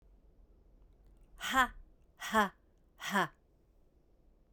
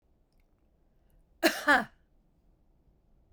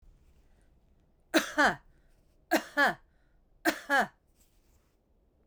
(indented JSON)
{
  "exhalation_length": "4.5 s",
  "exhalation_amplitude": 6057,
  "exhalation_signal_mean_std_ratio": 0.32,
  "cough_length": "3.3 s",
  "cough_amplitude": 12806,
  "cough_signal_mean_std_ratio": 0.24,
  "three_cough_length": "5.5 s",
  "three_cough_amplitude": 9507,
  "three_cough_signal_mean_std_ratio": 0.32,
  "survey_phase": "beta (2021-08-13 to 2022-03-07)",
  "age": "65+",
  "gender": "Female",
  "wearing_mask": "No",
  "symptom_none": true,
  "smoker_status": "Never smoked",
  "respiratory_condition_asthma": false,
  "respiratory_condition_other": false,
  "recruitment_source": "REACT",
  "submission_delay": "2 days",
  "covid_test_result": "Negative",
  "covid_test_method": "RT-qPCR",
  "influenza_a_test_result": "Negative",
  "influenza_b_test_result": "Negative"
}